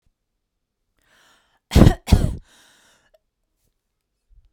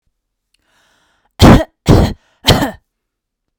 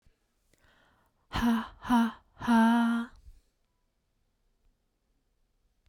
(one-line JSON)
{"cough_length": "4.5 s", "cough_amplitude": 32768, "cough_signal_mean_std_ratio": 0.22, "three_cough_length": "3.6 s", "three_cough_amplitude": 32768, "three_cough_signal_mean_std_ratio": 0.35, "exhalation_length": "5.9 s", "exhalation_amplitude": 6070, "exhalation_signal_mean_std_ratio": 0.38, "survey_phase": "beta (2021-08-13 to 2022-03-07)", "age": "18-44", "gender": "Female", "wearing_mask": "No", "symptom_none": true, "smoker_status": "Ex-smoker", "respiratory_condition_asthma": false, "respiratory_condition_other": false, "recruitment_source": "REACT", "submission_delay": "7 days", "covid_test_result": "Negative", "covid_test_method": "RT-qPCR"}